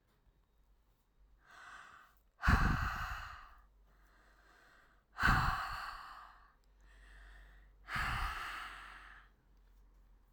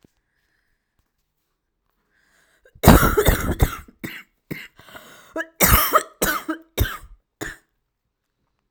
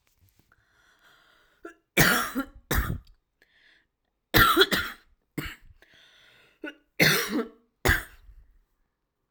{"exhalation_length": "10.3 s", "exhalation_amplitude": 4874, "exhalation_signal_mean_std_ratio": 0.4, "cough_length": "8.7 s", "cough_amplitude": 32768, "cough_signal_mean_std_ratio": 0.32, "three_cough_length": "9.3 s", "three_cough_amplitude": 23105, "three_cough_signal_mean_std_ratio": 0.35, "survey_phase": "alpha (2021-03-01 to 2021-08-12)", "age": "18-44", "gender": "Female", "wearing_mask": "No", "symptom_cough_any": true, "symptom_shortness_of_breath": true, "symptom_fatigue": true, "symptom_fever_high_temperature": true, "symptom_headache": true, "symptom_change_to_sense_of_smell_or_taste": true, "symptom_loss_of_taste": true, "smoker_status": "Ex-smoker", "respiratory_condition_asthma": true, "respiratory_condition_other": false, "recruitment_source": "Test and Trace", "submission_delay": "2 days", "covid_test_result": "Positive", "covid_test_method": "RT-qPCR", "covid_ct_value": 15.5, "covid_ct_gene": "ORF1ab gene", "covid_ct_mean": 16.6, "covid_viral_load": "3500000 copies/ml", "covid_viral_load_category": "High viral load (>1M copies/ml)"}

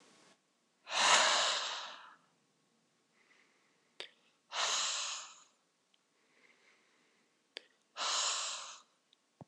{"exhalation_length": "9.5 s", "exhalation_amplitude": 7819, "exhalation_signal_mean_std_ratio": 0.39, "survey_phase": "beta (2021-08-13 to 2022-03-07)", "age": "18-44", "gender": "Male", "wearing_mask": "No", "symptom_none": true, "smoker_status": "Never smoked", "respiratory_condition_asthma": false, "respiratory_condition_other": false, "recruitment_source": "REACT", "submission_delay": "1 day", "covid_test_result": "Negative", "covid_test_method": "RT-qPCR", "influenza_a_test_result": "Negative", "influenza_b_test_result": "Negative"}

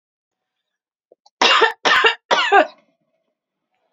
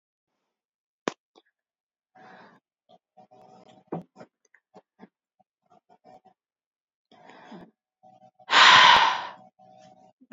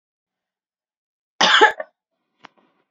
{"three_cough_length": "3.9 s", "three_cough_amplitude": 30888, "three_cough_signal_mean_std_ratio": 0.39, "exhalation_length": "10.3 s", "exhalation_amplitude": 24571, "exhalation_signal_mean_std_ratio": 0.22, "cough_length": "2.9 s", "cough_amplitude": 30260, "cough_signal_mean_std_ratio": 0.26, "survey_phase": "beta (2021-08-13 to 2022-03-07)", "age": "18-44", "gender": "Female", "wearing_mask": "No", "symptom_cough_any": true, "symptom_new_continuous_cough": true, "symptom_runny_or_blocked_nose": true, "symptom_shortness_of_breath": true, "symptom_sore_throat": true, "symptom_abdominal_pain": true, "symptom_fatigue": true, "symptom_headache": true, "smoker_status": "Current smoker (11 or more cigarettes per day)", "respiratory_condition_asthma": false, "respiratory_condition_other": false, "recruitment_source": "Test and Trace", "submission_delay": "1 day", "covid_test_method": "RT-qPCR", "covid_ct_value": 36.6, "covid_ct_gene": "ORF1ab gene"}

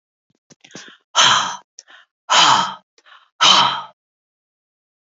{"exhalation_length": "5.0 s", "exhalation_amplitude": 32049, "exhalation_signal_mean_std_ratio": 0.39, "survey_phase": "beta (2021-08-13 to 2022-03-07)", "age": "45-64", "gender": "Female", "wearing_mask": "No", "symptom_cough_any": true, "symptom_runny_or_blocked_nose": true, "symptom_onset": "8 days", "smoker_status": "Never smoked", "respiratory_condition_asthma": false, "respiratory_condition_other": false, "recruitment_source": "REACT", "submission_delay": "2 days", "covid_test_result": "Positive", "covid_test_method": "RT-qPCR", "covid_ct_value": 25.0, "covid_ct_gene": "E gene", "influenza_a_test_result": "Negative", "influenza_b_test_result": "Negative"}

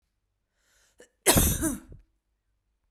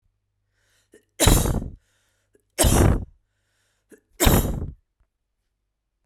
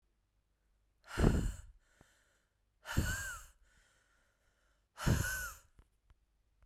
{"cough_length": "2.9 s", "cough_amplitude": 19929, "cough_signal_mean_std_ratio": 0.32, "three_cough_length": "6.1 s", "three_cough_amplitude": 30601, "three_cough_signal_mean_std_ratio": 0.36, "exhalation_length": "6.7 s", "exhalation_amplitude": 8056, "exhalation_signal_mean_std_ratio": 0.34, "survey_phase": "beta (2021-08-13 to 2022-03-07)", "age": "18-44", "gender": "Female", "wearing_mask": "No", "symptom_cough_any": true, "symptom_runny_or_blocked_nose": true, "symptom_other": true, "smoker_status": "Never smoked", "respiratory_condition_asthma": false, "respiratory_condition_other": false, "recruitment_source": "Test and Trace", "submission_delay": "2 days", "covid_test_result": "Positive", "covid_test_method": "RT-qPCR"}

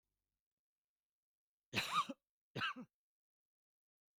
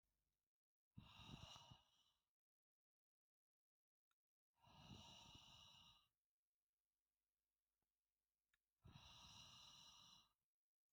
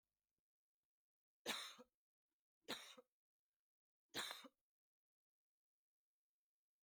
{"cough_length": "4.2 s", "cough_amplitude": 1751, "cough_signal_mean_std_ratio": 0.28, "exhalation_length": "10.9 s", "exhalation_amplitude": 162, "exhalation_signal_mean_std_ratio": 0.47, "three_cough_length": "6.8 s", "three_cough_amplitude": 799, "three_cough_signal_mean_std_ratio": 0.25, "survey_phase": "beta (2021-08-13 to 2022-03-07)", "age": "45-64", "gender": "Female", "wearing_mask": "No", "symptom_none": true, "smoker_status": "Ex-smoker", "respiratory_condition_asthma": false, "respiratory_condition_other": false, "recruitment_source": "REACT", "submission_delay": "1 day", "covid_test_result": "Negative", "covid_test_method": "RT-qPCR", "influenza_a_test_result": "Negative", "influenza_b_test_result": "Negative"}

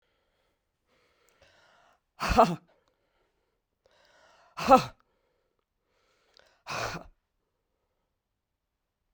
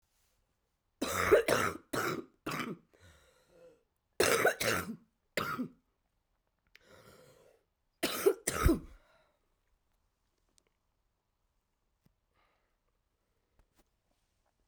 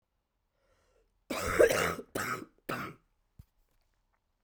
{"exhalation_length": "9.1 s", "exhalation_amplitude": 19889, "exhalation_signal_mean_std_ratio": 0.19, "three_cough_length": "14.7 s", "three_cough_amplitude": 7562, "three_cough_signal_mean_std_ratio": 0.31, "cough_length": "4.4 s", "cough_amplitude": 9496, "cough_signal_mean_std_ratio": 0.34, "survey_phase": "beta (2021-08-13 to 2022-03-07)", "age": "45-64", "gender": "Female", "wearing_mask": "No", "symptom_cough_any": true, "symptom_runny_or_blocked_nose": true, "symptom_sore_throat": true, "symptom_diarrhoea": true, "symptom_fatigue": true, "symptom_fever_high_temperature": true, "symptom_headache": true, "symptom_onset": "4 days", "smoker_status": "Current smoker (e-cigarettes or vapes only)", "respiratory_condition_asthma": false, "respiratory_condition_other": false, "recruitment_source": "Test and Trace", "submission_delay": "2 days", "covid_test_result": "Positive", "covid_test_method": "RT-qPCR", "covid_ct_value": 19.7, "covid_ct_gene": "S gene", "covid_ct_mean": 20.1, "covid_viral_load": "250000 copies/ml", "covid_viral_load_category": "Low viral load (10K-1M copies/ml)"}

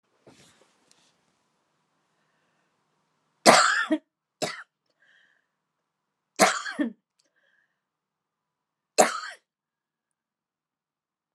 {"three_cough_length": "11.3 s", "three_cough_amplitude": 32767, "three_cough_signal_mean_std_ratio": 0.22, "survey_phase": "beta (2021-08-13 to 2022-03-07)", "age": "45-64", "gender": "Female", "wearing_mask": "Yes", "symptom_none": true, "smoker_status": "Ex-smoker", "respiratory_condition_asthma": false, "respiratory_condition_other": false, "recruitment_source": "REACT", "submission_delay": "1 day", "covid_test_result": "Negative", "covid_test_method": "RT-qPCR"}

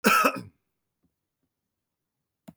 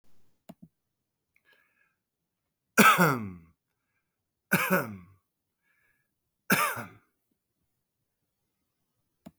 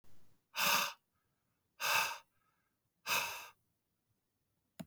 {"cough_length": "2.6 s", "cough_amplitude": 16785, "cough_signal_mean_std_ratio": 0.28, "three_cough_length": "9.4 s", "three_cough_amplitude": 17429, "three_cough_signal_mean_std_ratio": 0.25, "exhalation_length": "4.9 s", "exhalation_amplitude": 3518, "exhalation_signal_mean_std_ratio": 0.39, "survey_phase": "beta (2021-08-13 to 2022-03-07)", "age": "45-64", "gender": "Male", "wearing_mask": "No", "symptom_cough_any": true, "symptom_runny_or_blocked_nose": true, "symptom_abdominal_pain": true, "symptom_fatigue": true, "symptom_fever_high_temperature": true, "symptom_headache": true, "symptom_onset": "3 days", "smoker_status": "Never smoked", "respiratory_condition_asthma": false, "respiratory_condition_other": false, "recruitment_source": "Test and Trace", "submission_delay": "2 days", "covid_test_result": "Positive", "covid_test_method": "RT-qPCR", "covid_ct_value": 18.9, "covid_ct_gene": "ORF1ab gene", "covid_ct_mean": 19.3, "covid_viral_load": "470000 copies/ml", "covid_viral_load_category": "Low viral load (10K-1M copies/ml)"}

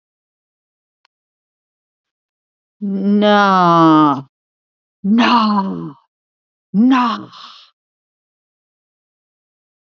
{"exhalation_length": "10.0 s", "exhalation_amplitude": 30460, "exhalation_signal_mean_std_ratio": 0.43, "survey_phase": "alpha (2021-03-01 to 2021-08-12)", "age": "65+", "gender": "Female", "wearing_mask": "No", "symptom_cough_any": true, "symptom_fatigue": true, "symptom_headache": true, "symptom_change_to_sense_of_smell_or_taste": true, "symptom_onset": "13 days", "smoker_status": "Never smoked", "respiratory_condition_asthma": false, "respiratory_condition_other": false, "recruitment_source": "REACT", "submission_delay": "1 day", "covid_test_result": "Negative", "covid_test_method": "RT-qPCR"}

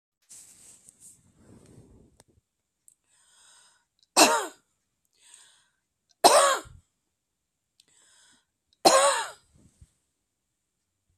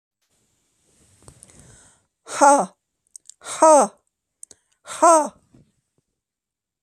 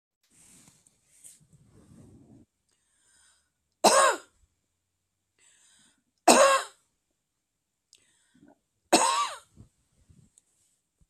{"cough_length": "11.2 s", "cough_amplitude": 28194, "cough_signal_mean_std_ratio": 0.24, "exhalation_length": "6.8 s", "exhalation_amplitude": 28396, "exhalation_signal_mean_std_ratio": 0.29, "three_cough_length": "11.1 s", "three_cough_amplitude": 25978, "three_cough_signal_mean_std_ratio": 0.24, "survey_phase": "beta (2021-08-13 to 2022-03-07)", "age": "45-64", "gender": "Female", "wearing_mask": "No", "symptom_none": true, "smoker_status": "Never smoked", "respiratory_condition_asthma": false, "respiratory_condition_other": false, "recruitment_source": "REACT", "submission_delay": "1 day", "covid_test_result": "Negative", "covid_test_method": "RT-qPCR"}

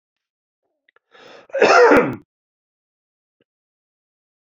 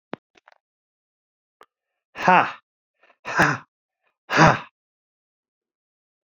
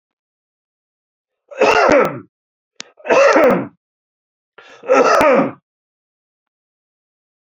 {"cough_length": "4.4 s", "cough_amplitude": 31734, "cough_signal_mean_std_ratio": 0.29, "exhalation_length": "6.4 s", "exhalation_amplitude": 27636, "exhalation_signal_mean_std_ratio": 0.25, "three_cough_length": "7.6 s", "three_cough_amplitude": 32767, "three_cough_signal_mean_std_ratio": 0.41, "survey_phase": "beta (2021-08-13 to 2022-03-07)", "age": "65+", "gender": "Male", "wearing_mask": "No", "symptom_none": true, "smoker_status": "Ex-smoker", "respiratory_condition_asthma": false, "respiratory_condition_other": false, "recruitment_source": "REACT", "submission_delay": "1 day", "covid_test_result": "Negative", "covid_test_method": "RT-qPCR"}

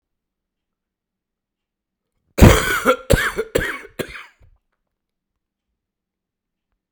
{"cough_length": "6.9 s", "cough_amplitude": 32768, "cough_signal_mean_std_ratio": 0.26, "survey_phase": "beta (2021-08-13 to 2022-03-07)", "age": "45-64", "gender": "Male", "wearing_mask": "No", "symptom_cough_any": true, "symptom_sore_throat": true, "symptom_fatigue": true, "symptom_fever_high_temperature": true, "symptom_onset": "3 days", "smoker_status": "Never smoked", "respiratory_condition_asthma": false, "respiratory_condition_other": false, "recruitment_source": "Test and Trace", "submission_delay": "1 day", "covid_test_result": "Positive", "covid_test_method": "RT-qPCR", "covid_ct_value": 17.0, "covid_ct_gene": "ORF1ab gene", "covid_ct_mean": 17.5, "covid_viral_load": "1800000 copies/ml", "covid_viral_load_category": "High viral load (>1M copies/ml)"}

